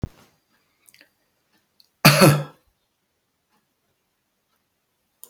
{"cough_length": "5.3 s", "cough_amplitude": 32768, "cough_signal_mean_std_ratio": 0.21, "survey_phase": "beta (2021-08-13 to 2022-03-07)", "age": "65+", "gender": "Male", "wearing_mask": "No", "symptom_none": true, "smoker_status": "Never smoked", "respiratory_condition_asthma": false, "respiratory_condition_other": false, "recruitment_source": "REACT", "submission_delay": "5 days", "covid_test_result": "Negative", "covid_test_method": "RT-qPCR", "influenza_a_test_result": "Negative", "influenza_b_test_result": "Negative"}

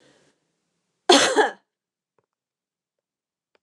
{"cough_length": "3.6 s", "cough_amplitude": 28311, "cough_signal_mean_std_ratio": 0.25, "survey_phase": "beta (2021-08-13 to 2022-03-07)", "age": "45-64", "gender": "Female", "wearing_mask": "No", "symptom_none": true, "smoker_status": "Never smoked", "respiratory_condition_asthma": false, "respiratory_condition_other": false, "recruitment_source": "Test and Trace", "submission_delay": "0 days", "covid_test_result": "Negative", "covid_test_method": "LFT"}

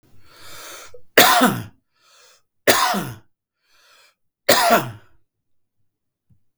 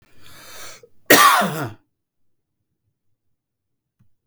{"three_cough_length": "6.6 s", "three_cough_amplitude": 32768, "three_cough_signal_mean_std_ratio": 0.35, "cough_length": "4.3 s", "cough_amplitude": 32768, "cough_signal_mean_std_ratio": 0.29, "survey_phase": "beta (2021-08-13 to 2022-03-07)", "age": "45-64", "gender": "Male", "wearing_mask": "No", "symptom_cough_any": true, "symptom_runny_or_blocked_nose": true, "smoker_status": "Never smoked", "respiratory_condition_asthma": false, "respiratory_condition_other": false, "recruitment_source": "REACT", "submission_delay": "1 day", "covid_test_result": "Negative", "covid_test_method": "RT-qPCR", "influenza_a_test_result": "Negative", "influenza_b_test_result": "Negative"}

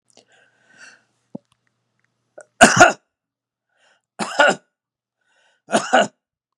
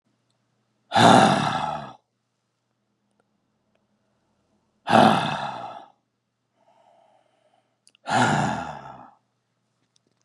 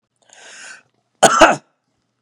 {"three_cough_length": "6.6 s", "three_cough_amplitude": 32768, "three_cough_signal_mean_std_ratio": 0.25, "exhalation_length": "10.2 s", "exhalation_amplitude": 30142, "exhalation_signal_mean_std_ratio": 0.33, "cough_length": "2.2 s", "cough_amplitude": 32768, "cough_signal_mean_std_ratio": 0.3, "survey_phase": "beta (2021-08-13 to 2022-03-07)", "age": "45-64", "gender": "Male", "wearing_mask": "No", "symptom_none": true, "smoker_status": "Never smoked", "respiratory_condition_asthma": false, "respiratory_condition_other": false, "recruitment_source": "REACT", "submission_delay": "0 days", "covid_test_result": "Negative", "covid_test_method": "RT-qPCR", "covid_ct_value": 41.0, "covid_ct_gene": "N gene", "influenza_a_test_result": "Unknown/Void", "influenza_b_test_result": "Unknown/Void"}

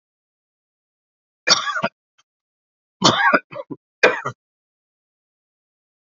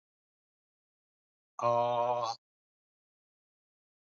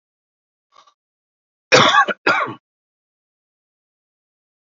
{"three_cough_length": "6.1 s", "three_cough_amplitude": 32768, "three_cough_signal_mean_std_ratio": 0.28, "exhalation_length": "4.0 s", "exhalation_amplitude": 5052, "exhalation_signal_mean_std_ratio": 0.34, "cough_length": "4.8 s", "cough_amplitude": 30536, "cough_signal_mean_std_ratio": 0.27, "survey_phase": "alpha (2021-03-01 to 2021-08-12)", "age": "45-64", "gender": "Male", "wearing_mask": "No", "symptom_cough_any": true, "smoker_status": "Ex-smoker", "respiratory_condition_asthma": false, "respiratory_condition_other": false, "recruitment_source": "Test and Trace", "submission_delay": "2 days", "covid_test_result": "Positive", "covid_test_method": "RT-qPCR", "covid_ct_value": 17.8, "covid_ct_gene": "ORF1ab gene", "covid_ct_mean": 18.4, "covid_viral_load": "920000 copies/ml", "covid_viral_load_category": "Low viral load (10K-1M copies/ml)"}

